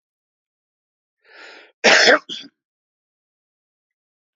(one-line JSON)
{"cough_length": "4.4 s", "cough_amplitude": 29257, "cough_signal_mean_std_ratio": 0.24, "survey_phase": "alpha (2021-03-01 to 2021-08-12)", "age": "45-64", "gender": "Male", "wearing_mask": "No", "symptom_none": true, "smoker_status": "Current smoker (11 or more cigarettes per day)", "respiratory_condition_asthma": false, "respiratory_condition_other": false, "recruitment_source": "REACT", "submission_delay": "1 day", "covid_test_result": "Negative", "covid_test_method": "RT-qPCR"}